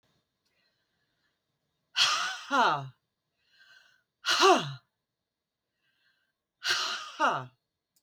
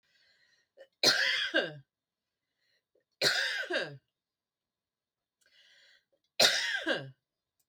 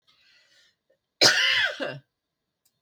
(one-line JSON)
{"exhalation_length": "8.0 s", "exhalation_amplitude": 11643, "exhalation_signal_mean_std_ratio": 0.35, "three_cough_length": "7.7 s", "three_cough_amplitude": 11402, "three_cough_signal_mean_std_ratio": 0.38, "cough_length": "2.8 s", "cough_amplitude": 22654, "cough_signal_mean_std_ratio": 0.37, "survey_phase": "beta (2021-08-13 to 2022-03-07)", "age": "65+", "gender": "Female", "wearing_mask": "No", "symptom_none": true, "smoker_status": "Ex-smoker", "respiratory_condition_asthma": false, "respiratory_condition_other": false, "recruitment_source": "REACT", "submission_delay": "8 days", "covid_test_result": "Negative", "covid_test_method": "RT-qPCR", "influenza_a_test_result": "Negative", "influenza_b_test_result": "Negative"}